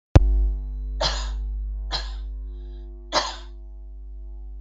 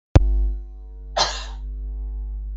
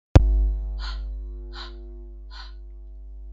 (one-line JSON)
{"three_cough_length": "4.6 s", "three_cough_amplitude": 32766, "three_cough_signal_mean_std_ratio": 0.65, "cough_length": "2.6 s", "cough_amplitude": 32766, "cough_signal_mean_std_ratio": 0.67, "exhalation_length": "3.3 s", "exhalation_amplitude": 32766, "exhalation_signal_mean_std_ratio": 0.5, "survey_phase": "beta (2021-08-13 to 2022-03-07)", "age": "45-64", "gender": "Female", "wearing_mask": "No", "symptom_none": true, "smoker_status": "Never smoked", "respiratory_condition_asthma": false, "respiratory_condition_other": true, "recruitment_source": "REACT", "submission_delay": "1 day", "covid_test_result": "Negative", "covid_test_method": "RT-qPCR"}